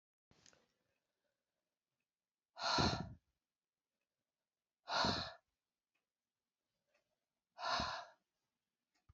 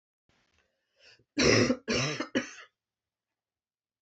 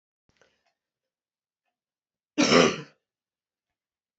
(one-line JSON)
{"exhalation_length": "9.1 s", "exhalation_amplitude": 2750, "exhalation_signal_mean_std_ratio": 0.29, "three_cough_length": "4.0 s", "three_cough_amplitude": 12979, "three_cough_signal_mean_std_ratio": 0.35, "cough_length": "4.2 s", "cough_amplitude": 18704, "cough_signal_mean_std_ratio": 0.22, "survey_phase": "beta (2021-08-13 to 2022-03-07)", "age": "45-64", "gender": "Female", "wearing_mask": "No", "symptom_cough_any": true, "symptom_runny_or_blocked_nose": true, "symptom_sore_throat": true, "symptom_fatigue": true, "smoker_status": "Never smoked", "respiratory_condition_asthma": false, "respiratory_condition_other": false, "recruitment_source": "Test and Trace", "submission_delay": "2 days", "covid_test_result": "Positive", "covid_test_method": "LFT"}